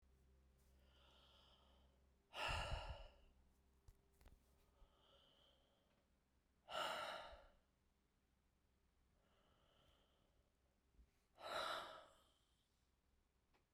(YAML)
exhalation_length: 13.7 s
exhalation_amplitude: 708
exhalation_signal_mean_std_ratio: 0.36
survey_phase: beta (2021-08-13 to 2022-03-07)
age: 45-64
gender: Female
wearing_mask: 'No'
symptom_cough_any: true
symptom_sore_throat: true
smoker_status: Never smoked
respiratory_condition_asthma: false
respiratory_condition_other: false
recruitment_source: Test and Trace
submission_delay: 1 day
covid_test_result: Positive
covid_test_method: RT-qPCR
covid_ct_value: 24.3
covid_ct_gene: ORF1ab gene